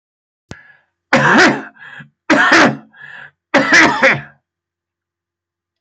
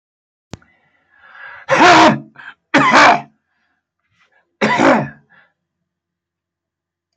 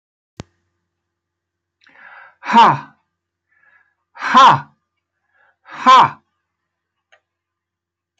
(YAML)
three_cough_length: 5.8 s
three_cough_amplitude: 31655
three_cough_signal_mean_std_ratio: 0.46
cough_length: 7.2 s
cough_amplitude: 32768
cough_signal_mean_std_ratio: 0.38
exhalation_length: 8.2 s
exhalation_amplitude: 32228
exhalation_signal_mean_std_ratio: 0.27
survey_phase: beta (2021-08-13 to 2022-03-07)
age: 65+
gender: Male
wearing_mask: 'No'
symptom_none: true
smoker_status: Never smoked
respiratory_condition_asthma: false
respiratory_condition_other: false
recruitment_source: REACT
submission_delay: 2 days
covid_test_result: Negative
covid_test_method: RT-qPCR